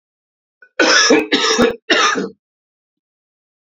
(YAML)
three_cough_length: 3.8 s
three_cough_amplitude: 32660
three_cough_signal_mean_std_ratio: 0.49
survey_phase: beta (2021-08-13 to 2022-03-07)
age: 45-64
gender: Male
wearing_mask: 'No'
symptom_cough_any: true
symptom_runny_or_blocked_nose: true
symptom_onset: 4 days
smoker_status: Ex-smoker
respiratory_condition_asthma: false
respiratory_condition_other: false
recruitment_source: Test and Trace
submission_delay: 2 days
covid_test_result: Positive
covid_test_method: ePCR